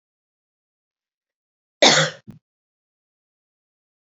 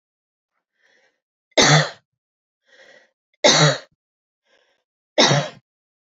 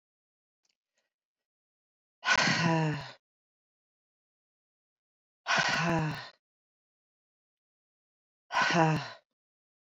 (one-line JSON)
{"cough_length": "4.1 s", "cough_amplitude": 29633, "cough_signal_mean_std_ratio": 0.2, "three_cough_length": "6.1 s", "three_cough_amplitude": 29578, "three_cough_signal_mean_std_ratio": 0.31, "exhalation_length": "9.9 s", "exhalation_amplitude": 9149, "exhalation_signal_mean_std_ratio": 0.37, "survey_phase": "beta (2021-08-13 to 2022-03-07)", "age": "45-64", "gender": "Female", "wearing_mask": "No", "symptom_none": true, "smoker_status": "Current smoker (1 to 10 cigarettes per day)", "respiratory_condition_asthma": false, "respiratory_condition_other": false, "recruitment_source": "REACT", "submission_delay": "11 days", "covid_test_result": "Negative", "covid_test_method": "RT-qPCR"}